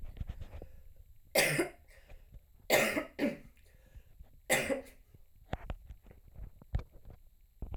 {
  "three_cough_length": "7.8 s",
  "three_cough_amplitude": 7317,
  "three_cough_signal_mean_std_ratio": 0.44,
  "survey_phase": "alpha (2021-03-01 to 2021-08-12)",
  "age": "18-44",
  "gender": "Female",
  "wearing_mask": "No",
  "symptom_cough_any": true,
  "symptom_fatigue": true,
  "symptom_fever_high_temperature": true,
  "symptom_headache": true,
  "smoker_status": "Never smoked",
  "respiratory_condition_asthma": true,
  "respiratory_condition_other": false,
  "recruitment_source": "Test and Trace",
  "submission_delay": "1 day",
  "covid_test_result": "Positive",
  "covid_test_method": "RT-qPCR"
}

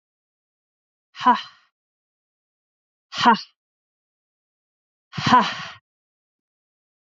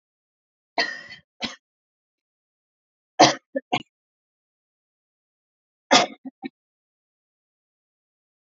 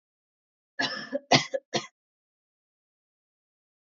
{
  "exhalation_length": "7.1 s",
  "exhalation_amplitude": 28525,
  "exhalation_signal_mean_std_ratio": 0.24,
  "three_cough_length": "8.5 s",
  "three_cough_amplitude": 29707,
  "three_cough_signal_mean_std_ratio": 0.19,
  "cough_length": "3.8 s",
  "cough_amplitude": 20643,
  "cough_signal_mean_std_ratio": 0.24,
  "survey_phase": "beta (2021-08-13 to 2022-03-07)",
  "age": "18-44",
  "gender": "Female",
  "wearing_mask": "No",
  "symptom_none": true,
  "symptom_onset": "12 days",
  "smoker_status": "Ex-smoker",
  "respiratory_condition_asthma": false,
  "respiratory_condition_other": false,
  "recruitment_source": "REACT",
  "submission_delay": "2 days",
  "covid_test_result": "Negative",
  "covid_test_method": "RT-qPCR",
  "influenza_a_test_result": "Negative",
  "influenza_b_test_result": "Negative"
}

